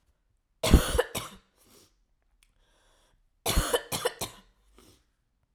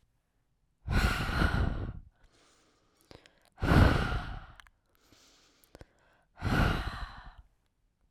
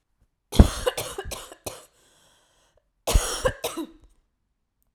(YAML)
three_cough_length: 5.5 s
three_cough_amplitude: 17794
three_cough_signal_mean_std_ratio: 0.29
exhalation_length: 8.1 s
exhalation_amplitude: 10636
exhalation_signal_mean_std_ratio: 0.41
cough_length: 4.9 s
cough_amplitude: 32060
cough_signal_mean_std_ratio: 0.27
survey_phase: alpha (2021-03-01 to 2021-08-12)
age: 18-44
gender: Female
wearing_mask: 'No'
symptom_cough_any: true
symptom_fatigue: true
symptom_fever_high_temperature: true
symptom_headache: true
smoker_status: Never smoked
respiratory_condition_asthma: false
respiratory_condition_other: false
recruitment_source: Test and Trace
submission_delay: 2 days
covid_test_result: Positive
covid_test_method: RT-qPCR
covid_ct_value: 28.6
covid_ct_gene: ORF1ab gene
covid_ct_mean: 29.1
covid_viral_load: 290 copies/ml
covid_viral_load_category: Minimal viral load (< 10K copies/ml)